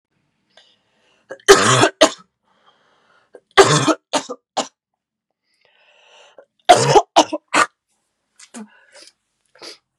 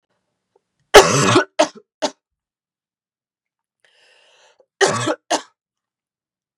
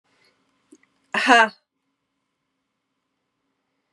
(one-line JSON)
{"three_cough_length": "10.0 s", "three_cough_amplitude": 32768, "three_cough_signal_mean_std_ratio": 0.3, "cough_length": "6.6 s", "cough_amplitude": 32768, "cough_signal_mean_std_ratio": 0.27, "exhalation_length": "3.9 s", "exhalation_amplitude": 32601, "exhalation_signal_mean_std_ratio": 0.21, "survey_phase": "beta (2021-08-13 to 2022-03-07)", "age": "18-44", "gender": "Female", "wearing_mask": "No", "symptom_new_continuous_cough": true, "symptom_runny_or_blocked_nose": true, "symptom_shortness_of_breath": true, "symptom_sore_throat": true, "symptom_fatigue": true, "symptom_headache": true, "symptom_change_to_sense_of_smell_or_taste": true, "symptom_onset": "11 days", "smoker_status": "Never smoked", "respiratory_condition_asthma": false, "respiratory_condition_other": false, "recruitment_source": "REACT", "submission_delay": "2 days", "covid_test_result": "Positive", "covid_test_method": "RT-qPCR", "covid_ct_value": 21.0, "covid_ct_gene": "E gene", "influenza_a_test_result": "Unknown/Void", "influenza_b_test_result": "Unknown/Void"}